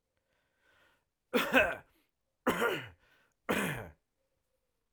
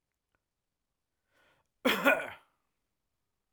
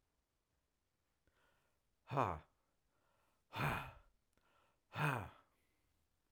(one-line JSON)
{"three_cough_length": "4.9 s", "three_cough_amplitude": 11464, "three_cough_signal_mean_std_ratio": 0.35, "cough_length": "3.5 s", "cough_amplitude": 11023, "cough_signal_mean_std_ratio": 0.24, "exhalation_length": "6.3 s", "exhalation_amplitude": 2487, "exhalation_signal_mean_std_ratio": 0.3, "survey_phase": "alpha (2021-03-01 to 2021-08-12)", "age": "18-44", "gender": "Male", "wearing_mask": "No", "symptom_none": true, "smoker_status": "Never smoked", "respiratory_condition_asthma": false, "respiratory_condition_other": false, "recruitment_source": "REACT", "submission_delay": "2 days", "covid_test_result": "Negative", "covid_test_method": "RT-qPCR"}